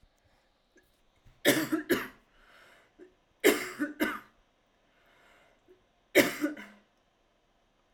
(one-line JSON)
{"three_cough_length": "7.9 s", "three_cough_amplitude": 13912, "three_cough_signal_mean_std_ratio": 0.3, "survey_phase": "alpha (2021-03-01 to 2021-08-12)", "age": "18-44", "gender": "Female", "wearing_mask": "No", "symptom_none": true, "smoker_status": "Never smoked", "respiratory_condition_asthma": true, "respiratory_condition_other": false, "recruitment_source": "REACT", "submission_delay": "1 day", "covid_test_result": "Negative", "covid_test_method": "RT-qPCR"}